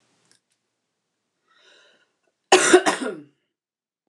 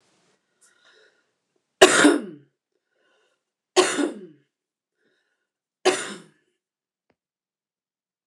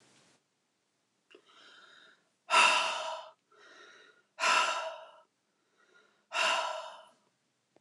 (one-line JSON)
{"cough_length": "4.1 s", "cough_amplitude": 27915, "cough_signal_mean_std_ratio": 0.25, "three_cough_length": "8.3 s", "three_cough_amplitude": 29204, "three_cough_signal_mean_std_ratio": 0.24, "exhalation_length": "7.8 s", "exhalation_amplitude": 8912, "exhalation_signal_mean_std_ratio": 0.37, "survey_phase": "beta (2021-08-13 to 2022-03-07)", "age": "45-64", "gender": "Female", "wearing_mask": "No", "symptom_cough_any": true, "symptom_change_to_sense_of_smell_or_taste": true, "smoker_status": "Never smoked", "respiratory_condition_asthma": false, "respiratory_condition_other": false, "recruitment_source": "Test and Trace", "submission_delay": "3 days", "covid_test_result": "Positive", "covid_test_method": "RT-qPCR", "covid_ct_value": 21.8, "covid_ct_gene": "N gene", "covid_ct_mean": 21.9, "covid_viral_load": "64000 copies/ml", "covid_viral_load_category": "Low viral load (10K-1M copies/ml)"}